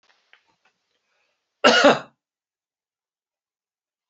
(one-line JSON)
{"cough_length": "4.1 s", "cough_amplitude": 32767, "cough_signal_mean_std_ratio": 0.22, "survey_phase": "beta (2021-08-13 to 2022-03-07)", "age": "65+", "gender": "Male", "wearing_mask": "No", "symptom_none": true, "smoker_status": "Never smoked", "respiratory_condition_asthma": false, "respiratory_condition_other": false, "recruitment_source": "REACT", "submission_delay": "3 days", "covid_test_result": "Negative", "covid_test_method": "RT-qPCR", "influenza_a_test_result": "Negative", "influenza_b_test_result": "Negative"}